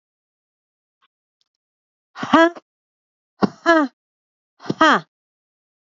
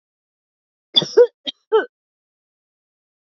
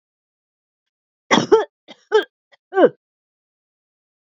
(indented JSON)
{
  "exhalation_length": "6.0 s",
  "exhalation_amplitude": 32767,
  "exhalation_signal_mean_std_ratio": 0.25,
  "cough_length": "3.2 s",
  "cough_amplitude": 28050,
  "cough_signal_mean_std_ratio": 0.24,
  "three_cough_length": "4.3 s",
  "three_cough_amplitude": 29396,
  "three_cough_signal_mean_std_ratio": 0.26,
  "survey_phase": "beta (2021-08-13 to 2022-03-07)",
  "age": "45-64",
  "gender": "Female",
  "wearing_mask": "No",
  "symptom_none": true,
  "smoker_status": "Never smoked",
  "respiratory_condition_asthma": false,
  "respiratory_condition_other": false,
  "recruitment_source": "REACT",
  "submission_delay": "1 day",
  "covid_test_result": "Negative",
  "covid_test_method": "RT-qPCR",
  "influenza_a_test_result": "Negative",
  "influenza_b_test_result": "Negative"
}